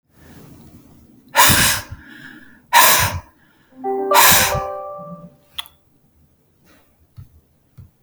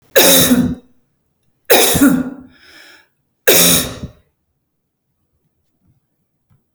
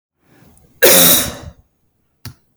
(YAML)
exhalation_length: 8.0 s
exhalation_amplitude: 32768
exhalation_signal_mean_std_ratio: 0.4
three_cough_length: 6.7 s
three_cough_amplitude: 32768
three_cough_signal_mean_std_ratio: 0.42
cough_length: 2.6 s
cough_amplitude: 32768
cough_signal_mean_std_ratio: 0.38
survey_phase: beta (2021-08-13 to 2022-03-07)
age: 45-64
gender: Female
wearing_mask: 'No'
symptom_fatigue: true
symptom_headache: true
smoker_status: Never smoked
respiratory_condition_asthma: false
respiratory_condition_other: false
recruitment_source: REACT
submission_delay: 1 day
covid_test_result: Negative
covid_test_method: RT-qPCR
influenza_a_test_result: Negative
influenza_b_test_result: Negative